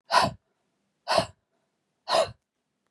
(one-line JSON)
{"exhalation_length": "2.9 s", "exhalation_amplitude": 15954, "exhalation_signal_mean_std_ratio": 0.34, "survey_phase": "beta (2021-08-13 to 2022-03-07)", "age": "45-64", "gender": "Female", "wearing_mask": "No", "symptom_cough_any": true, "symptom_runny_or_blocked_nose": true, "smoker_status": "Never smoked", "respiratory_condition_asthma": false, "respiratory_condition_other": false, "recruitment_source": "Test and Trace", "submission_delay": "2 days", "covid_test_result": "Positive", "covid_test_method": "RT-qPCR", "covid_ct_value": 20.2, "covid_ct_gene": "N gene"}